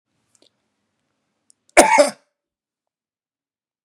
{"three_cough_length": "3.8 s", "three_cough_amplitude": 32768, "three_cough_signal_mean_std_ratio": 0.21, "survey_phase": "beta (2021-08-13 to 2022-03-07)", "age": "18-44", "gender": "Male", "wearing_mask": "No", "symptom_none": true, "smoker_status": "Never smoked", "respiratory_condition_asthma": false, "respiratory_condition_other": false, "recruitment_source": "REACT", "submission_delay": "2 days", "covid_test_result": "Negative", "covid_test_method": "RT-qPCR", "influenza_a_test_result": "Unknown/Void", "influenza_b_test_result": "Unknown/Void"}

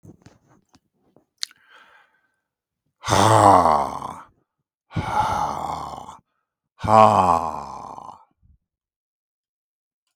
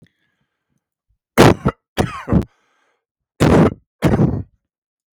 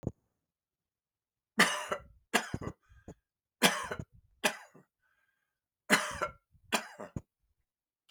{"exhalation_length": "10.2 s", "exhalation_amplitude": 32766, "exhalation_signal_mean_std_ratio": 0.35, "cough_length": "5.1 s", "cough_amplitude": 32768, "cough_signal_mean_std_ratio": 0.37, "three_cough_length": "8.1 s", "three_cough_amplitude": 12883, "three_cough_signal_mean_std_ratio": 0.29, "survey_phase": "beta (2021-08-13 to 2022-03-07)", "age": "65+", "gender": "Male", "wearing_mask": "No", "symptom_none": true, "smoker_status": "Ex-smoker", "respiratory_condition_asthma": false, "respiratory_condition_other": false, "recruitment_source": "REACT", "submission_delay": "4 days", "covid_test_result": "Negative", "covid_test_method": "RT-qPCR", "influenza_a_test_result": "Negative", "influenza_b_test_result": "Negative"}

